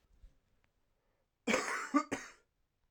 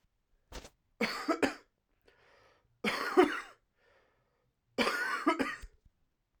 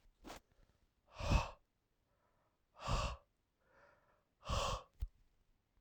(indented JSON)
{
  "cough_length": "2.9 s",
  "cough_amplitude": 4999,
  "cough_signal_mean_std_ratio": 0.34,
  "three_cough_length": "6.4 s",
  "three_cough_amplitude": 9352,
  "three_cough_signal_mean_std_ratio": 0.38,
  "exhalation_length": "5.8 s",
  "exhalation_amplitude": 3150,
  "exhalation_signal_mean_std_ratio": 0.34,
  "survey_phase": "alpha (2021-03-01 to 2021-08-12)",
  "age": "18-44",
  "gender": "Male",
  "wearing_mask": "No",
  "symptom_cough_any": true,
  "symptom_fatigue": true,
  "symptom_fever_high_temperature": true,
  "symptom_headache": true,
  "symptom_onset": "2 days",
  "smoker_status": "Ex-smoker",
  "respiratory_condition_asthma": false,
  "respiratory_condition_other": false,
  "recruitment_source": "Test and Trace",
  "submission_delay": "1 day",
  "covid_test_result": "Positive",
  "covid_test_method": "RT-qPCR",
  "covid_ct_value": 24.8,
  "covid_ct_gene": "ORF1ab gene"
}